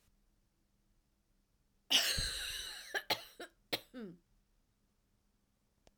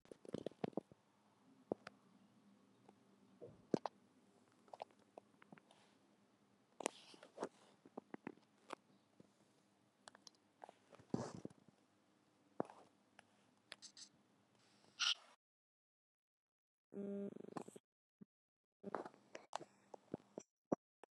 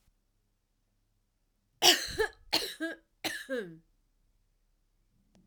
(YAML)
cough_length: 6.0 s
cough_amplitude: 6058
cough_signal_mean_std_ratio: 0.34
exhalation_length: 21.2 s
exhalation_amplitude: 4044
exhalation_signal_mean_std_ratio: 0.24
three_cough_length: 5.5 s
three_cough_amplitude: 17804
three_cough_signal_mean_std_ratio: 0.28
survey_phase: alpha (2021-03-01 to 2021-08-12)
age: 45-64
gender: Female
wearing_mask: 'No'
symptom_diarrhoea: true
symptom_fatigue: true
symptom_loss_of_taste: true
symptom_onset: 5 days
smoker_status: Never smoked
respiratory_condition_asthma: false
respiratory_condition_other: false
recruitment_source: Test and Trace
submission_delay: 2 days
covid_test_result: Positive
covid_test_method: RT-qPCR
covid_ct_value: 18.3
covid_ct_gene: ORF1ab gene
covid_ct_mean: 18.6
covid_viral_load: 800000 copies/ml
covid_viral_load_category: Low viral load (10K-1M copies/ml)